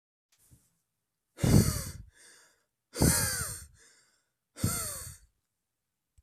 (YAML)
exhalation_length: 6.2 s
exhalation_amplitude: 12825
exhalation_signal_mean_std_ratio: 0.34
survey_phase: alpha (2021-03-01 to 2021-08-12)
age: 18-44
gender: Male
wearing_mask: 'No'
symptom_none: true
smoker_status: Never smoked
respiratory_condition_asthma: false
respiratory_condition_other: false
recruitment_source: REACT
submission_delay: 3 days
covid_test_result: Negative
covid_test_method: RT-qPCR